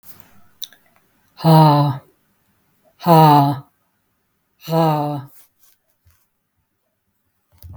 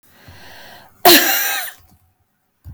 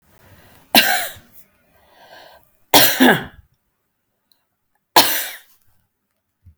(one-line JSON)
{"exhalation_length": "7.8 s", "exhalation_amplitude": 32766, "exhalation_signal_mean_std_ratio": 0.36, "cough_length": "2.7 s", "cough_amplitude": 32768, "cough_signal_mean_std_ratio": 0.37, "three_cough_length": "6.6 s", "three_cough_amplitude": 32768, "three_cough_signal_mean_std_ratio": 0.31, "survey_phase": "beta (2021-08-13 to 2022-03-07)", "age": "45-64", "gender": "Female", "wearing_mask": "No", "symptom_none": true, "smoker_status": "Never smoked", "respiratory_condition_asthma": false, "respiratory_condition_other": false, "recruitment_source": "Test and Trace", "submission_delay": "1 day", "covid_test_method": "RT-qPCR"}